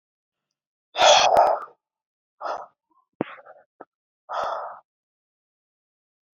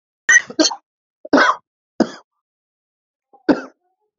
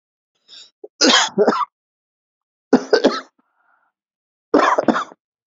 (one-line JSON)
{"exhalation_length": "6.4 s", "exhalation_amplitude": 22457, "exhalation_signal_mean_std_ratio": 0.31, "cough_length": "4.2 s", "cough_amplitude": 29992, "cough_signal_mean_std_ratio": 0.31, "three_cough_length": "5.5 s", "three_cough_amplitude": 32767, "three_cough_signal_mean_std_ratio": 0.38, "survey_phase": "beta (2021-08-13 to 2022-03-07)", "age": "18-44", "gender": "Male", "wearing_mask": "No", "symptom_runny_or_blocked_nose": true, "symptom_headache": true, "smoker_status": "Ex-smoker", "respiratory_condition_asthma": false, "respiratory_condition_other": false, "recruitment_source": "Test and Trace", "submission_delay": "2 days", "covid_test_result": "Positive", "covid_test_method": "RT-qPCR", "covid_ct_value": 29.1, "covid_ct_gene": "ORF1ab gene"}